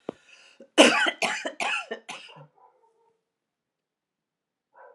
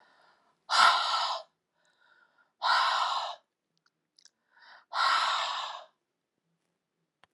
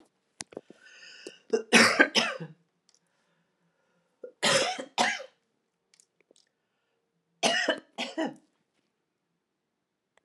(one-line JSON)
{"cough_length": "4.9 s", "cough_amplitude": 28045, "cough_signal_mean_std_ratio": 0.29, "exhalation_length": "7.3 s", "exhalation_amplitude": 14107, "exhalation_signal_mean_std_ratio": 0.43, "three_cough_length": "10.2 s", "three_cough_amplitude": 19689, "three_cough_signal_mean_std_ratio": 0.31, "survey_phase": "alpha (2021-03-01 to 2021-08-12)", "age": "65+", "gender": "Female", "wearing_mask": "No", "symptom_none": true, "smoker_status": "Ex-smoker", "respiratory_condition_asthma": false, "respiratory_condition_other": false, "recruitment_source": "REACT", "submission_delay": "1 day", "covid_test_result": "Negative", "covid_test_method": "RT-qPCR"}